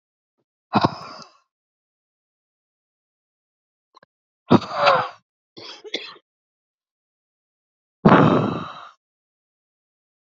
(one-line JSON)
{"exhalation_length": "10.2 s", "exhalation_amplitude": 32767, "exhalation_signal_mean_std_ratio": 0.26, "survey_phase": "beta (2021-08-13 to 2022-03-07)", "age": "18-44", "gender": "Female", "wearing_mask": "No", "symptom_cough_any": true, "symptom_new_continuous_cough": true, "symptom_runny_or_blocked_nose": true, "symptom_shortness_of_breath": true, "symptom_sore_throat": true, "symptom_abdominal_pain": true, "symptom_change_to_sense_of_smell_or_taste": true, "symptom_loss_of_taste": true, "smoker_status": "Never smoked", "respiratory_condition_asthma": false, "respiratory_condition_other": false, "recruitment_source": "Test and Trace", "submission_delay": "3 days", "covid_test_result": "Positive", "covid_test_method": "ePCR"}